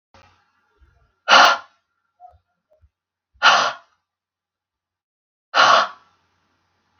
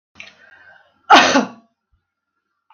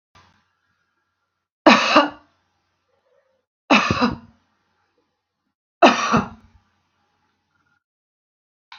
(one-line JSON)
{"exhalation_length": "7.0 s", "exhalation_amplitude": 32768, "exhalation_signal_mean_std_ratio": 0.28, "cough_length": "2.7 s", "cough_amplitude": 32768, "cough_signal_mean_std_ratio": 0.28, "three_cough_length": "8.8 s", "three_cough_amplitude": 32768, "three_cough_signal_mean_std_ratio": 0.27, "survey_phase": "beta (2021-08-13 to 2022-03-07)", "age": "45-64", "gender": "Female", "wearing_mask": "No", "symptom_none": true, "smoker_status": "Never smoked", "respiratory_condition_asthma": false, "respiratory_condition_other": false, "recruitment_source": "REACT", "submission_delay": "1 day", "covid_test_result": "Negative", "covid_test_method": "RT-qPCR", "influenza_a_test_result": "Negative", "influenza_b_test_result": "Negative"}